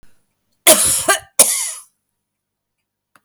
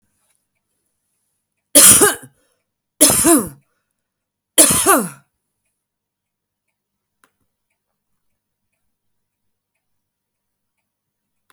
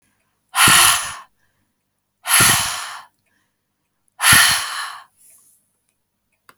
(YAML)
cough_length: 3.2 s
cough_amplitude: 32768
cough_signal_mean_std_ratio: 0.35
three_cough_length: 11.5 s
three_cough_amplitude: 32768
three_cough_signal_mean_std_ratio: 0.25
exhalation_length: 6.6 s
exhalation_amplitude: 32768
exhalation_signal_mean_std_ratio: 0.39
survey_phase: alpha (2021-03-01 to 2021-08-12)
age: 45-64
gender: Female
wearing_mask: 'No'
symptom_none: true
smoker_status: Ex-smoker
respiratory_condition_asthma: false
respiratory_condition_other: false
recruitment_source: REACT
submission_delay: 1 day
covid_test_result: Negative
covid_test_method: RT-qPCR